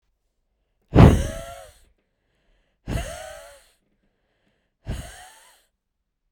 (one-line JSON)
{"exhalation_length": "6.3 s", "exhalation_amplitude": 32768, "exhalation_signal_mean_std_ratio": 0.22, "survey_phase": "beta (2021-08-13 to 2022-03-07)", "age": "45-64", "gender": "Female", "wearing_mask": "No", "symptom_none": true, "smoker_status": "Never smoked", "respiratory_condition_asthma": true, "respiratory_condition_other": false, "recruitment_source": "REACT", "submission_delay": "1 day", "covid_test_result": "Negative", "covid_test_method": "RT-qPCR"}